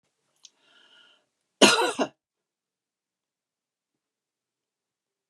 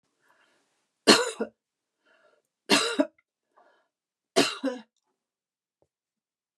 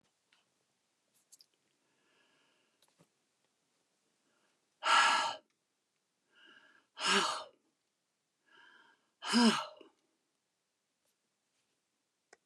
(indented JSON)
{
  "cough_length": "5.3 s",
  "cough_amplitude": 25891,
  "cough_signal_mean_std_ratio": 0.19,
  "three_cough_length": "6.6 s",
  "three_cough_amplitude": 24730,
  "three_cough_signal_mean_std_ratio": 0.25,
  "exhalation_length": "12.5 s",
  "exhalation_amplitude": 6702,
  "exhalation_signal_mean_std_ratio": 0.25,
  "survey_phase": "beta (2021-08-13 to 2022-03-07)",
  "age": "65+",
  "gender": "Female",
  "wearing_mask": "No",
  "symptom_none": true,
  "smoker_status": "Never smoked",
  "respiratory_condition_asthma": false,
  "respiratory_condition_other": false,
  "recruitment_source": "REACT",
  "submission_delay": "2 days",
  "covid_test_result": "Negative",
  "covid_test_method": "RT-qPCR"
}